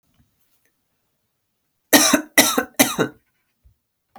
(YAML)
three_cough_length: 4.2 s
three_cough_amplitude: 32768
three_cough_signal_mean_std_ratio: 0.31
survey_phase: beta (2021-08-13 to 2022-03-07)
age: 45-64
gender: Female
wearing_mask: 'No'
symptom_runny_or_blocked_nose: true
symptom_sore_throat: true
symptom_onset: 12 days
smoker_status: Never smoked
respiratory_condition_asthma: false
respiratory_condition_other: false
recruitment_source: REACT
submission_delay: 1 day
covid_test_result: Negative
covid_test_method: RT-qPCR